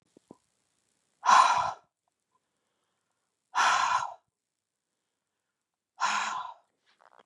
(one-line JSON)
{"exhalation_length": "7.3 s", "exhalation_amplitude": 16054, "exhalation_signal_mean_std_ratio": 0.33, "survey_phase": "beta (2021-08-13 to 2022-03-07)", "age": "45-64", "gender": "Female", "wearing_mask": "No", "symptom_cough_any": true, "symptom_new_continuous_cough": true, "symptom_runny_or_blocked_nose": true, "symptom_sore_throat": true, "symptom_fatigue": true, "symptom_headache": true, "symptom_onset": "2 days", "smoker_status": "Never smoked", "respiratory_condition_asthma": false, "respiratory_condition_other": false, "recruitment_source": "Test and Trace", "submission_delay": "1 day", "covid_test_result": "Negative", "covid_test_method": "RT-qPCR"}